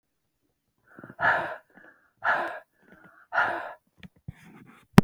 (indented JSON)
{
  "exhalation_length": "5.0 s",
  "exhalation_amplitude": 32768,
  "exhalation_signal_mean_std_ratio": 0.28,
  "survey_phase": "beta (2021-08-13 to 2022-03-07)",
  "age": "45-64",
  "gender": "Female",
  "wearing_mask": "No",
  "symptom_none": true,
  "symptom_onset": "12 days",
  "smoker_status": "Never smoked",
  "respiratory_condition_asthma": false,
  "respiratory_condition_other": false,
  "recruitment_source": "REACT",
  "submission_delay": "6 days",
  "covid_test_result": "Negative",
  "covid_test_method": "RT-qPCR"
}